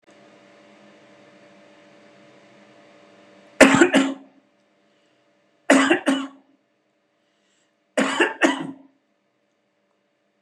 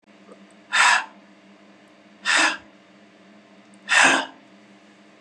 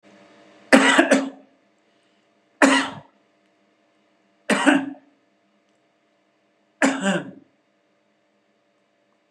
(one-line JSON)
{"three_cough_length": "10.4 s", "three_cough_amplitude": 32768, "three_cough_signal_mean_std_ratio": 0.29, "exhalation_length": "5.2 s", "exhalation_amplitude": 25032, "exhalation_signal_mean_std_ratio": 0.37, "cough_length": "9.3 s", "cough_amplitude": 32767, "cough_signal_mean_std_ratio": 0.31, "survey_phase": "beta (2021-08-13 to 2022-03-07)", "age": "65+", "gender": "Male", "wearing_mask": "No", "symptom_none": true, "smoker_status": "Ex-smoker", "respiratory_condition_asthma": false, "respiratory_condition_other": false, "recruitment_source": "REACT", "submission_delay": "0 days", "covid_test_result": "Negative", "covid_test_method": "RT-qPCR", "influenza_a_test_result": "Negative", "influenza_b_test_result": "Negative"}